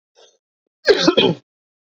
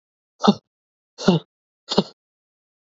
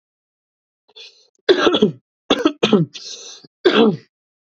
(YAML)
cough_length: 2.0 s
cough_amplitude: 32767
cough_signal_mean_std_ratio: 0.36
exhalation_length: 2.9 s
exhalation_amplitude: 28180
exhalation_signal_mean_std_ratio: 0.25
three_cough_length: 4.5 s
three_cough_amplitude: 30573
three_cough_signal_mean_std_ratio: 0.4
survey_phase: beta (2021-08-13 to 2022-03-07)
age: 18-44
gender: Male
wearing_mask: 'No'
symptom_none: true
smoker_status: Never smoked
respiratory_condition_asthma: false
respiratory_condition_other: false
recruitment_source: REACT
submission_delay: 4 days
covid_test_result: Negative
covid_test_method: RT-qPCR
influenza_a_test_result: Negative
influenza_b_test_result: Negative